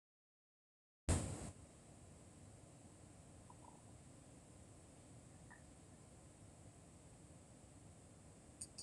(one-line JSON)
{"cough_length": "8.8 s", "cough_amplitude": 2928, "cough_signal_mean_std_ratio": 0.42, "survey_phase": "alpha (2021-03-01 to 2021-08-12)", "age": "65+", "gender": "Female", "wearing_mask": "No", "symptom_none": true, "smoker_status": "Never smoked", "respiratory_condition_asthma": false, "respiratory_condition_other": false, "recruitment_source": "REACT", "submission_delay": "2 days", "covid_test_result": "Negative", "covid_test_method": "RT-qPCR"}